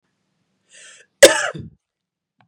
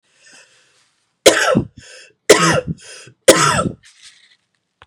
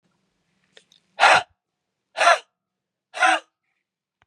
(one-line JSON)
{"cough_length": "2.5 s", "cough_amplitude": 32768, "cough_signal_mean_std_ratio": 0.21, "three_cough_length": "4.9 s", "three_cough_amplitude": 32768, "three_cough_signal_mean_std_ratio": 0.37, "exhalation_length": "4.3 s", "exhalation_amplitude": 30859, "exhalation_signal_mean_std_ratio": 0.29, "survey_phase": "beta (2021-08-13 to 2022-03-07)", "age": "45-64", "gender": "Female", "wearing_mask": "No", "symptom_cough_any": true, "symptom_runny_or_blocked_nose": true, "symptom_fatigue": true, "symptom_headache": true, "symptom_onset": "2 days", "smoker_status": "Never smoked", "respiratory_condition_asthma": false, "respiratory_condition_other": false, "recruitment_source": "Test and Trace", "submission_delay": "2 days", "covid_test_result": "Positive", "covid_test_method": "RT-qPCR", "covid_ct_value": 22.2, "covid_ct_gene": "ORF1ab gene", "covid_ct_mean": 22.6, "covid_viral_load": "38000 copies/ml", "covid_viral_load_category": "Low viral load (10K-1M copies/ml)"}